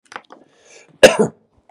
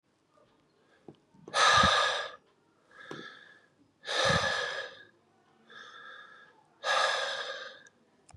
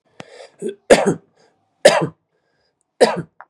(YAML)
cough_length: 1.7 s
cough_amplitude: 32768
cough_signal_mean_std_ratio: 0.26
exhalation_length: 8.4 s
exhalation_amplitude: 9305
exhalation_signal_mean_std_ratio: 0.43
three_cough_length: 3.5 s
three_cough_amplitude: 32768
three_cough_signal_mean_std_ratio: 0.31
survey_phase: beta (2021-08-13 to 2022-03-07)
age: 45-64
gender: Male
wearing_mask: 'No'
symptom_headache: true
symptom_onset: 4 days
smoker_status: Never smoked
respiratory_condition_asthma: false
respiratory_condition_other: false
recruitment_source: REACT
submission_delay: 2 days
covid_test_result: Positive
covid_test_method: RT-qPCR
covid_ct_value: 18.0
covid_ct_gene: E gene
influenza_a_test_result: Negative
influenza_b_test_result: Negative